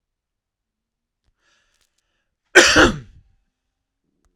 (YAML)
cough_length: 4.4 s
cough_amplitude: 32768
cough_signal_mean_std_ratio: 0.23
survey_phase: alpha (2021-03-01 to 2021-08-12)
age: 45-64
gender: Male
wearing_mask: 'No'
symptom_none: true
smoker_status: Never smoked
respiratory_condition_asthma: false
respiratory_condition_other: false
recruitment_source: REACT
submission_delay: 2 days
covid_test_result: Negative
covid_test_method: RT-qPCR